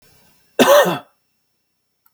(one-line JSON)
{"cough_length": "2.1 s", "cough_amplitude": 30331, "cough_signal_mean_std_ratio": 0.34, "survey_phase": "alpha (2021-03-01 to 2021-08-12)", "age": "18-44", "gender": "Male", "wearing_mask": "No", "symptom_none": true, "smoker_status": "Never smoked", "respiratory_condition_asthma": false, "respiratory_condition_other": false, "recruitment_source": "REACT", "submission_delay": "2 days", "covid_test_result": "Negative", "covid_test_method": "RT-qPCR"}